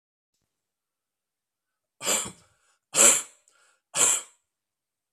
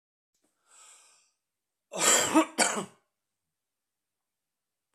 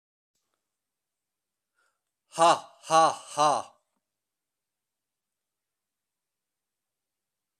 three_cough_length: 5.1 s
three_cough_amplitude: 20583
three_cough_signal_mean_std_ratio: 0.28
cough_length: 4.9 s
cough_amplitude: 12544
cough_signal_mean_std_ratio: 0.29
exhalation_length: 7.6 s
exhalation_amplitude: 12794
exhalation_signal_mean_std_ratio: 0.23
survey_phase: beta (2021-08-13 to 2022-03-07)
age: 45-64
gender: Male
wearing_mask: 'No'
symptom_fatigue: true
symptom_onset: 3 days
smoker_status: Ex-smoker
respiratory_condition_asthma: false
respiratory_condition_other: false
recruitment_source: Test and Trace
submission_delay: 2 days
covid_test_result: Positive
covid_test_method: RT-qPCR
covid_ct_value: 14.9
covid_ct_gene: ORF1ab gene
covid_ct_mean: 15.1
covid_viral_load: 11000000 copies/ml
covid_viral_load_category: High viral load (>1M copies/ml)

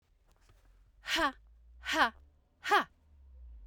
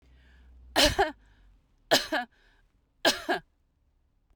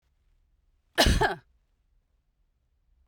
exhalation_length: 3.7 s
exhalation_amplitude: 6568
exhalation_signal_mean_std_ratio: 0.37
three_cough_length: 4.4 s
three_cough_amplitude: 13783
three_cough_signal_mean_std_ratio: 0.34
cough_length: 3.1 s
cough_amplitude: 12410
cough_signal_mean_std_ratio: 0.27
survey_phase: beta (2021-08-13 to 2022-03-07)
age: 45-64
gender: Female
wearing_mask: 'No'
symptom_none: true
smoker_status: Never smoked
respiratory_condition_asthma: false
respiratory_condition_other: false
recruitment_source: REACT
submission_delay: 2 days
covid_test_result: Negative
covid_test_method: RT-qPCR
influenza_a_test_result: Negative
influenza_b_test_result: Negative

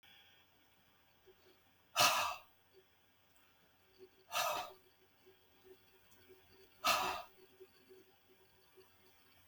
exhalation_length: 9.5 s
exhalation_amplitude: 4784
exhalation_signal_mean_std_ratio: 0.3
survey_phase: beta (2021-08-13 to 2022-03-07)
age: 65+
gender: Male
wearing_mask: 'No'
symptom_none: true
smoker_status: Ex-smoker
respiratory_condition_asthma: true
respiratory_condition_other: false
recruitment_source: REACT
submission_delay: 1 day
covid_test_result: Negative
covid_test_method: RT-qPCR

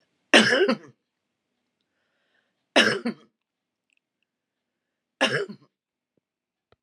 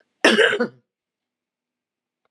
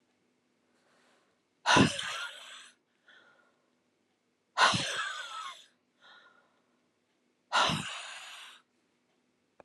three_cough_length: 6.8 s
three_cough_amplitude: 29949
three_cough_signal_mean_std_ratio: 0.27
cough_length: 2.3 s
cough_amplitude: 31135
cough_signal_mean_std_ratio: 0.32
exhalation_length: 9.6 s
exhalation_amplitude: 12816
exhalation_signal_mean_std_ratio: 0.32
survey_phase: alpha (2021-03-01 to 2021-08-12)
age: 65+
gender: Female
wearing_mask: 'No'
symptom_cough_any: true
symptom_shortness_of_breath: true
smoker_status: Ex-smoker
respiratory_condition_asthma: false
respiratory_condition_other: false
recruitment_source: REACT
submission_delay: 2 days
covid_test_result: Negative
covid_test_method: RT-qPCR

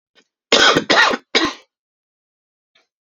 three_cough_length: 3.1 s
three_cough_amplitude: 32767
three_cough_signal_mean_std_ratio: 0.39
survey_phase: alpha (2021-03-01 to 2021-08-12)
age: 18-44
gender: Male
wearing_mask: 'No'
symptom_cough_any: true
symptom_shortness_of_breath: true
symptom_fatigue: true
symptom_headache: true
symptom_loss_of_taste: true
symptom_onset: 4 days
smoker_status: Never smoked
respiratory_condition_asthma: false
respiratory_condition_other: false
recruitment_source: Test and Trace
submission_delay: 2 days
covid_test_result: Positive
covid_test_method: RT-qPCR
covid_ct_value: 13.7
covid_ct_gene: N gene
covid_ct_mean: 14.0
covid_viral_load: 25000000 copies/ml
covid_viral_load_category: High viral load (>1M copies/ml)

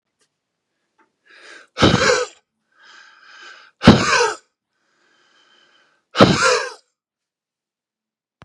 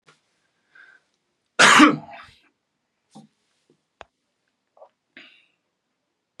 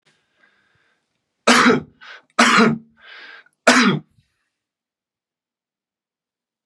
exhalation_length: 8.4 s
exhalation_amplitude: 32768
exhalation_signal_mean_std_ratio: 0.31
cough_length: 6.4 s
cough_amplitude: 32767
cough_signal_mean_std_ratio: 0.2
three_cough_length: 6.7 s
three_cough_amplitude: 32768
three_cough_signal_mean_std_ratio: 0.32
survey_phase: beta (2021-08-13 to 2022-03-07)
age: 45-64
gender: Male
wearing_mask: 'No'
symptom_none: true
smoker_status: Never smoked
respiratory_condition_asthma: false
respiratory_condition_other: false
recruitment_source: Test and Trace
submission_delay: 2 days
covid_test_result: Positive
covid_test_method: RT-qPCR
covid_ct_value: 21.5
covid_ct_gene: ORF1ab gene
covid_ct_mean: 21.6
covid_viral_load: 82000 copies/ml
covid_viral_load_category: Low viral load (10K-1M copies/ml)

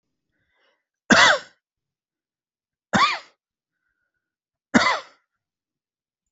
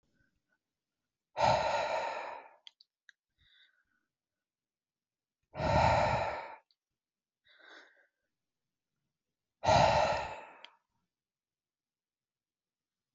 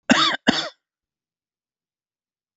three_cough_length: 6.3 s
three_cough_amplitude: 27689
three_cough_signal_mean_std_ratio: 0.26
exhalation_length: 13.1 s
exhalation_amplitude: 6475
exhalation_signal_mean_std_ratio: 0.34
cough_length: 2.6 s
cough_amplitude: 27760
cough_signal_mean_std_ratio: 0.3
survey_phase: beta (2021-08-13 to 2022-03-07)
age: 18-44
gender: Male
wearing_mask: 'No'
symptom_none: true
smoker_status: Ex-smoker
respiratory_condition_asthma: false
respiratory_condition_other: false
recruitment_source: REACT
submission_delay: 0 days
covid_test_result: Negative
covid_test_method: RT-qPCR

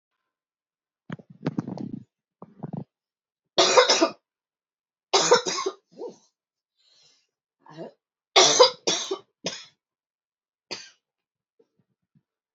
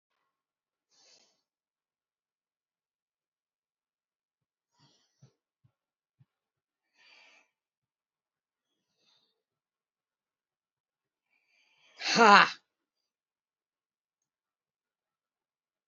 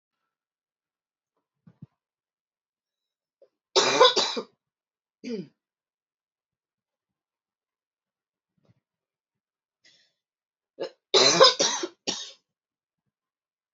three_cough_length: 12.5 s
three_cough_amplitude: 25619
three_cough_signal_mean_std_ratio: 0.29
exhalation_length: 15.9 s
exhalation_amplitude: 21050
exhalation_signal_mean_std_ratio: 0.11
cough_length: 13.7 s
cough_amplitude: 21949
cough_signal_mean_std_ratio: 0.23
survey_phase: alpha (2021-03-01 to 2021-08-12)
age: 65+
gender: Female
wearing_mask: 'No'
symptom_none: true
symptom_headache: true
smoker_status: Never smoked
respiratory_condition_asthma: false
respiratory_condition_other: false
recruitment_source: REACT
submission_delay: 2 days
covid_test_result: Negative
covid_test_method: RT-qPCR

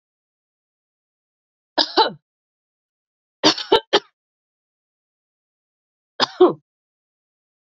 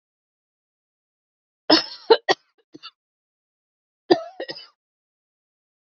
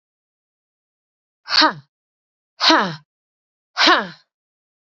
three_cough_length: 7.7 s
three_cough_amplitude: 30551
three_cough_signal_mean_std_ratio: 0.22
cough_length: 6.0 s
cough_amplitude: 27794
cough_signal_mean_std_ratio: 0.19
exhalation_length: 4.9 s
exhalation_amplitude: 29737
exhalation_signal_mean_std_ratio: 0.3
survey_phase: beta (2021-08-13 to 2022-03-07)
age: 18-44
gender: Female
wearing_mask: 'No'
symptom_cough_any: true
symptom_runny_or_blocked_nose: true
symptom_fatigue: true
symptom_onset: 2 days
smoker_status: Ex-smoker
respiratory_condition_asthma: false
respiratory_condition_other: false
recruitment_source: Test and Trace
submission_delay: 2 days
covid_test_result: Positive
covid_test_method: ePCR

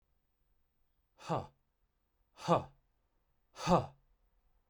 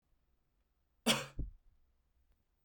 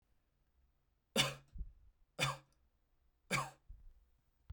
exhalation_length: 4.7 s
exhalation_amplitude: 5810
exhalation_signal_mean_std_ratio: 0.26
cough_length: 2.6 s
cough_amplitude: 4553
cough_signal_mean_std_ratio: 0.25
three_cough_length: 4.5 s
three_cough_amplitude: 3592
three_cough_signal_mean_std_ratio: 0.31
survey_phase: beta (2021-08-13 to 2022-03-07)
age: 18-44
gender: Male
wearing_mask: 'No'
symptom_none: true
smoker_status: Never smoked
respiratory_condition_asthma: false
respiratory_condition_other: false
recruitment_source: REACT
submission_delay: 3 days
covid_test_result: Negative
covid_test_method: RT-qPCR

